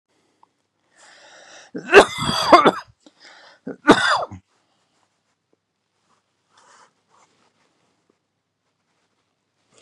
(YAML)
cough_length: 9.8 s
cough_amplitude: 32768
cough_signal_mean_std_ratio: 0.23
survey_phase: beta (2021-08-13 to 2022-03-07)
age: 65+
gender: Male
wearing_mask: 'No'
symptom_runny_or_blocked_nose: true
symptom_onset: 2 days
smoker_status: Never smoked
respiratory_condition_asthma: false
respiratory_condition_other: false
recruitment_source: REACT
submission_delay: 1 day
covid_test_result: Negative
covid_test_method: RT-qPCR
influenza_a_test_result: Negative
influenza_b_test_result: Negative